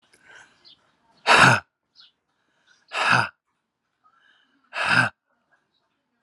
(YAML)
exhalation_length: 6.2 s
exhalation_amplitude: 27700
exhalation_signal_mean_std_ratio: 0.3
survey_phase: alpha (2021-03-01 to 2021-08-12)
age: 45-64
gender: Male
wearing_mask: 'No'
symptom_cough_any: true
symptom_fatigue: true
symptom_headache: true
symptom_onset: 3 days
smoker_status: Never smoked
respiratory_condition_asthma: false
respiratory_condition_other: false
recruitment_source: Test and Trace
submission_delay: 2 days
covid_test_result: Positive
covid_test_method: RT-qPCR
covid_ct_value: 23.3
covid_ct_gene: ORF1ab gene
covid_ct_mean: 24.3
covid_viral_load: 11000 copies/ml
covid_viral_load_category: Low viral load (10K-1M copies/ml)